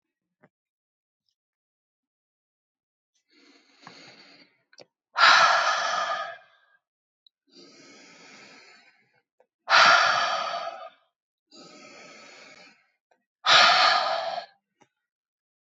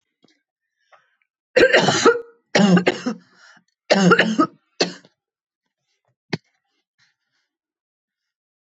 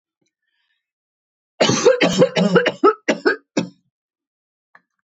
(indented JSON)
{
  "exhalation_length": "15.6 s",
  "exhalation_amplitude": 20115,
  "exhalation_signal_mean_std_ratio": 0.34,
  "three_cough_length": "8.6 s",
  "three_cough_amplitude": 25183,
  "three_cough_signal_mean_std_ratio": 0.35,
  "cough_length": "5.0 s",
  "cough_amplitude": 25798,
  "cough_signal_mean_std_ratio": 0.41,
  "survey_phase": "alpha (2021-03-01 to 2021-08-12)",
  "age": "45-64",
  "gender": "Female",
  "wearing_mask": "No",
  "symptom_none": true,
  "smoker_status": "Never smoked",
  "respiratory_condition_asthma": false,
  "respiratory_condition_other": false,
  "recruitment_source": "REACT",
  "submission_delay": "2 days",
  "covid_test_result": "Negative",
  "covid_test_method": "RT-qPCR"
}